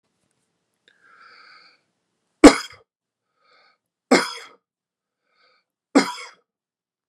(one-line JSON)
{"three_cough_length": "7.1 s", "three_cough_amplitude": 32768, "three_cough_signal_mean_std_ratio": 0.17, "survey_phase": "beta (2021-08-13 to 2022-03-07)", "age": "45-64", "gender": "Male", "wearing_mask": "No", "symptom_headache": true, "smoker_status": "Never smoked", "respiratory_condition_asthma": false, "respiratory_condition_other": false, "recruitment_source": "REACT", "submission_delay": "1 day", "covid_test_result": "Negative", "covid_test_method": "RT-qPCR"}